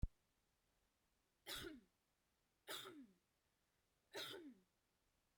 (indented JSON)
{
  "three_cough_length": "5.4 s",
  "three_cough_amplitude": 1184,
  "three_cough_signal_mean_std_ratio": 0.32,
  "survey_phase": "beta (2021-08-13 to 2022-03-07)",
  "age": "18-44",
  "gender": "Female",
  "wearing_mask": "No",
  "symptom_none": true,
  "symptom_onset": "2 days",
  "smoker_status": "Current smoker (e-cigarettes or vapes only)",
  "respiratory_condition_asthma": false,
  "respiratory_condition_other": false,
  "recruitment_source": "REACT",
  "submission_delay": "2 days",
  "covid_test_result": "Negative",
  "covid_test_method": "RT-qPCR",
  "influenza_a_test_result": "Negative",
  "influenza_b_test_result": "Negative"
}